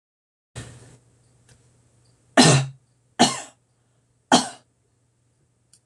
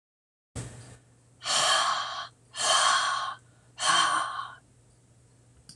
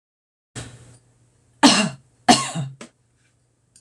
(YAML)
three_cough_length: 5.9 s
three_cough_amplitude: 26028
three_cough_signal_mean_std_ratio: 0.25
exhalation_length: 5.8 s
exhalation_amplitude: 10440
exhalation_signal_mean_std_ratio: 0.55
cough_length: 3.8 s
cough_amplitude: 26028
cough_signal_mean_std_ratio: 0.29
survey_phase: alpha (2021-03-01 to 2021-08-12)
age: 65+
gender: Female
wearing_mask: 'No'
symptom_none: true
smoker_status: Never smoked
respiratory_condition_asthma: false
respiratory_condition_other: false
recruitment_source: REACT
submission_delay: 1 day
covid_test_result: Negative
covid_test_method: RT-qPCR